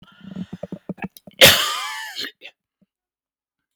cough_length: 3.8 s
cough_amplitude: 32768
cough_signal_mean_std_ratio: 0.29
survey_phase: beta (2021-08-13 to 2022-03-07)
age: 45-64
gender: Male
wearing_mask: 'No'
symptom_none: true
smoker_status: Never smoked
respiratory_condition_asthma: false
respiratory_condition_other: false
recruitment_source: REACT
submission_delay: 1 day
covid_test_result: Negative
covid_test_method: RT-qPCR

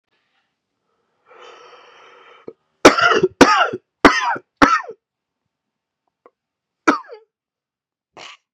three_cough_length: 8.5 s
three_cough_amplitude: 32768
three_cough_signal_mean_std_ratio: 0.29
survey_phase: beta (2021-08-13 to 2022-03-07)
age: 18-44
gender: Male
wearing_mask: 'No'
symptom_cough_any: true
symptom_new_continuous_cough: true
symptom_runny_or_blocked_nose: true
symptom_shortness_of_breath: true
symptom_sore_throat: true
symptom_fatigue: true
symptom_headache: true
symptom_change_to_sense_of_smell_or_taste: true
symptom_onset: 3 days
smoker_status: Ex-smoker
respiratory_condition_asthma: false
respiratory_condition_other: false
recruitment_source: Test and Trace
submission_delay: 1 day
covid_test_result: Positive
covid_test_method: ePCR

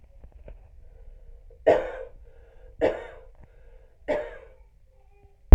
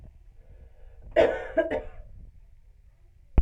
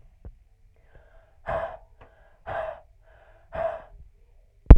three_cough_length: 5.5 s
three_cough_amplitude: 32768
three_cough_signal_mean_std_ratio: 0.21
cough_length: 3.4 s
cough_amplitude: 14132
cough_signal_mean_std_ratio: 0.36
exhalation_length: 4.8 s
exhalation_amplitude: 32768
exhalation_signal_mean_std_ratio: 0.18
survey_phase: alpha (2021-03-01 to 2021-08-12)
age: 18-44
gender: Female
wearing_mask: 'No'
symptom_none: true
smoker_status: Never smoked
respiratory_condition_asthma: true
respiratory_condition_other: false
recruitment_source: REACT
submission_delay: 1 day
covid_test_result: Negative
covid_test_method: RT-qPCR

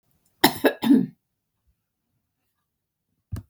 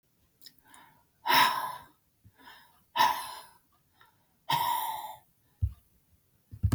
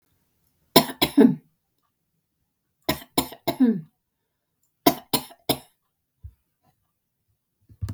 cough_length: 3.5 s
cough_amplitude: 32768
cough_signal_mean_std_ratio: 0.27
exhalation_length: 6.7 s
exhalation_amplitude: 10349
exhalation_signal_mean_std_ratio: 0.38
three_cough_length: 7.9 s
three_cough_amplitude: 32768
three_cough_signal_mean_std_ratio: 0.26
survey_phase: beta (2021-08-13 to 2022-03-07)
age: 65+
gender: Female
wearing_mask: 'No'
symptom_none: true
smoker_status: Ex-smoker
respiratory_condition_asthma: false
respiratory_condition_other: false
recruitment_source: REACT
submission_delay: 1 day
covid_test_result: Negative
covid_test_method: RT-qPCR
influenza_a_test_result: Negative
influenza_b_test_result: Negative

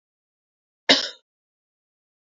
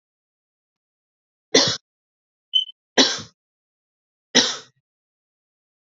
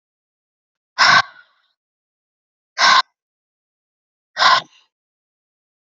cough_length: 2.4 s
cough_amplitude: 27352
cough_signal_mean_std_ratio: 0.18
three_cough_length: 5.8 s
three_cough_amplitude: 31509
three_cough_signal_mean_std_ratio: 0.25
exhalation_length: 5.9 s
exhalation_amplitude: 30695
exhalation_signal_mean_std_ratio: 0.28
survey_phase: beta (2021-08-13 to 2022-03-07)
age: 18-44
gender: Female
wearing_mask: 'No'
symptom_cough_any: true
symptom_runny_or_blocked_nose: true
symptom_fatigue: true
symptom_onset: 4 days
smoker_status: Ex-smoker
respiratory_condition_asthma: false
respiratory_condition_other: false
recruitment_source: Test and Trace
submission_delay: 2 days
covid_test_result: Positive
covid_test_method: RT-qPCR
covid_ct_value: 19.2
covid_ct_gene: N gene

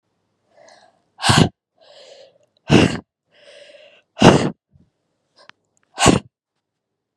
exhalation_length: 7.2 s
exhalation_amplitude: 32768
exhalation_signal_mean_std_ratio: 0.28
survey_phase: beta (2021-08-13 to 2022-03-07)
age: 18-44
gender: Female
wearing_mask: 'No'
symptom_cough_any: true
symptom_fatigue: true
symptom_headache: true
symptom_other: true
symptom_onset: 4 days
smoker_status: Ex-smoker
respiratory_condition_asthma: false
respiratory_condition_other: false
recruitment_source: Test and Trace
submission_delay: 1 day
covid_test_result: Positive
covid_test_method: ePCR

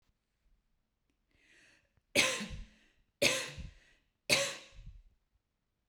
three_cough_length: 5.9 s
three_cough_amplitude: 8235
three_cough_signal_mean_std_ratio: 0.31
survey_phase: beta (2021-08-13 to 2022-03-07)
age: 45-64
gender: Female
wearing_mask: 'No'
symptom_none: true
smoker_status: Never smoked
respiratory_condition_asthma: false
respiratory_condition_other: false
recruitment_source: REACT
submission_delay: 1 day
covid_test_result: Negative
covid_test_method: RT-qPCR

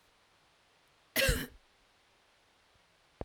cough_length: 3.2 s
cough_amplitude: 5548
cough_signal_mean_std_ratio: 0.26
survey_phase: beta (2021-08-13 to 2022-03-07)
age: 45-64
gender: Female
wearing_mask: 'No'
symptom_cough_any: true
symptom_runny_or_blocked_nose: true
symptom_sore_throat: true
symptom_onset: 12 days
smoker_status: Never smoked
respiratory_condition_asthma: false
respiratory_condition_other: false
recruitment_source: REACT
submission_delay: 2 days
covid_test_result: Negative
covid_test_method: RT-qPCR
influenza_a_test_result: Negative
influenza_b_test_result: Negative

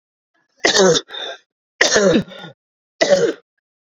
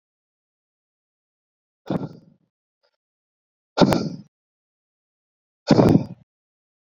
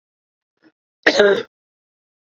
three_cough_length: 3.8 s
three_cough_amplitude: 30874
three_cough_signal_mean_std_ratio: 0.47
exhalation_length: 6.9 s
exhalation_amplitude: 29489
exhalation_signal_mean_std_ratio: 0.24
cough_length: 2.3 s
cough_amplitude: 32174
cough_signal_mean_std_ratio: 0.3
survey_phase: beta (2021-08-13 to 2022-03-07)
age: 18-44
gender: Male
wearing_mask: 'No'
symptom_runny_or_blocked_nose: true
symptom_onset: 3 days
smoker_status: Current smoker (11 or more cigarettes per day)
respiratory_condition_asthma: false
respiratory_condition_other: false
recruitment_source: Test and Trace
submission_delay: 2 days
covid_test_result: Positive
covid_test_method: RT-qPCR
covid_ct_value: 13.4
covid_ct_gene: ORF1ab gene
covid_ct_mean: 14.1
covid_viral_load: 24000000 copies/ml
covid_viral_load_category: High viral load (>1M copies/ml)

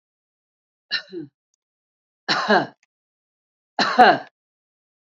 three_cough_length: 5.0 s
three_cough_amplitude: 27499
three_cough_signal_mean_std_ratio: 0.29
survey_phase: beta (2021-08-13 to 2022-03-07)
age: 65+
gender: Female
wearing_mask: 'No'
symptom_none: true
smoker_status: Current smoker (11 or more cigarettes per day)
respiratory_condition_asthma: false
respiratory_condition_other: false
recruitment_source: Test and Trace
submission_delay: 1 day
covid_test_result: Positive
covid_test_method: RT-qPCR
covid_ct_value: 24.7
covid_ct_gene: N gene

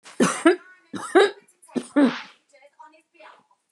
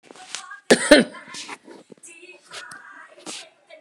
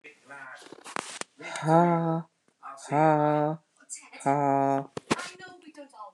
three_cough_length: 3.7 s
three_cough_amplitude: 24438
three_cough_signal_mean_std_ratio: 0.37
cough_length: 3.8 s
cough_amplitude: 29204
cough_signal_mean_std_ratio: 0.27
exhalation_length: 6.1 s
exhalation_amplitude: 13628
exhalation_signal_mean_std_ratio: 0.46
survey_phase: beta (2021-08-13 to 2022-03-07)
age: 65+
gender: Female
wearing_mask: 'No'
symptom_none: true
smoker_status: Ex-smoker
respiratory_condition_asthma: false
respiratory_condition_other: false
recruitment_source: REACT
submission_delay: 5 days
covid_test_result: Negative
covid_test_method: RT-qPCR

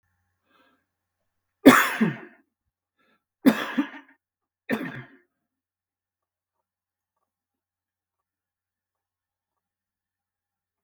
three_cough_length: 10.8 s
three_cough_amplitude: 32768
three_cough_signal_mean_std_ratio: 0.18
survey_phase: beta (2021-08-13 to 2022-03-07)
age: 65+
gender: Male
wearing_mask: 'No'
symptom_cough_any: true
smoker_status: Ex-smoker
respiratory_condition_asthma: true
respiratory_condition_other: false
recruitment_source: REACT
submission_delay: 2 days
covid_test_result: Negative
covid_test_method: RT-qPCR
influenza_a_test_result: Negative
influenza_b_test_result: Negative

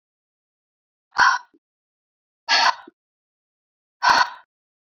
exhalation_length: 4.9 s
exhalation_amplitude: 24013
exhalation_signal_mean_std_ratio: 0.3
survey_phase: beta (2021-08-13 to 2022-03-07)
age: 18-44
gender: Female
wearing_mask: 'No'
symptom_cough_any: true
symptom_runny_or_blocked_nose: true
symptom_sore_throat: true
symptom_headache: true
symptom_change_to_sense_of_smell_or_taste: true
smoker_status: Never smoked
respiratory_condition_asthma: false
respiratory_condition_other: false
recruitment_source: Test and Trace
submission_delay: 2 days
covid_test_result: Positive
covid_test_method: RT-qPCR
covid_ct_value: 19.1
covid_ct_gene: ORF1ab gene
covid_ct_mean: 20.2
covid_viral_load: 230000 copies/ml
covid_viral_load_category: Low viral load (10K-1M copies/ml)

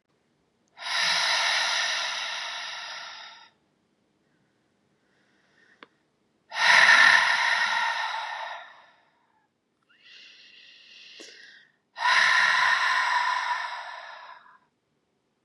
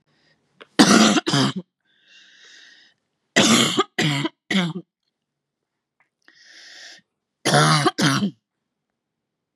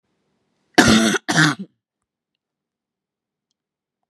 exhalation_length: 15.4 s
exhalation_amplitude: 20179
exhalation_signal_mean_std_ratio: 0.49
three_cough_length: 9.6 s
three_cough_amplitude: 32142
three_cough_signal_mean_std_ratio: 0.41
cough_length: 4.1 s
cough_amplitude: 32768
cough_signal_mean_std_ratio: 0.31
survey_phase: beta (2021-08-13 to 2022-03-07)
age: 18-44
gender: Female
wearing_mask: 'No'
symptom_none: true
smoker_status: Never smoked
respiratory_condition_asthma: false
respiratory_condition_other: false
recruitment_source: REACT
submission_delay: 1 day
covid_test_result: Negative
covid_test_method: RT-qPCR
influenza_a_test_result: Negative
influenza_b_test_result: Negative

